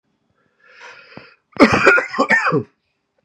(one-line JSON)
{"cough_length": "3.2 s", "cough_amplitude": 32768, "cough_signal_mean_std_ratio": 0.42, "survey_phase": "beta (2021-08-13 to 2022-03-07)", "age": "18-44", "gender": "Male", "wearing_mask": "No", "symptom_shortness_of_breath": true, "symptom_fatigue": true, "symptom_onset": "12 days", "smoker_status": "Never smoked", "respiratory_condition_asthma": false, "respiratory_condition_other": false, "recruitment_source": "REACT", "submission_delay": "2 days", "covid_test_result": "Negative", "covid_test_method": "RT-qPCR", "influenza_a_test_result": "Negative", "influenza_b_test_result": "Negative"}